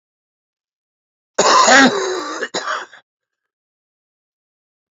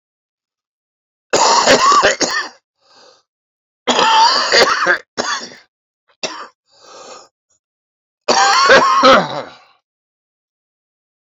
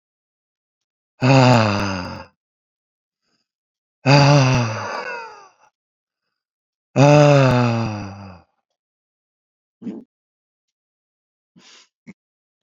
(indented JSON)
{
  "cough_length": "4.9 s",
  "cough_amplitude": 30938,
  "cough_signal_mean_std_ratio": 0.36,
  "three_cough_length": "11.3 s",
  "three_cough_amplitude": 32767,
  "three_cough_signal_mean_std_ratio": 0.47,
  "exhalation_length": "12.6 s",
  "exhalation_amplitude": 31424,
  "exhalation_signal_mean_std_ratio": 0.37,
  "survey_phase": "beta (2021-08-13 to 2022-03-07)",
  "age": "45-64",
  "gender": "Male",
  "wearing_mask": "No",
  "symptom_none": true,
  "symptom_onset": "12 days",
  "smoker_status": "Current smoker (1 to 10 cigarettes per day)",
  "respiratory_condition_asthma": true,
  "respiratory_condition_other": true,
  "recruitment_source": "REACT",
  "submission_delay": "1 day",
  "covid_test_result": "Negative",
  "covid_test_method": "RT-qPCR"
}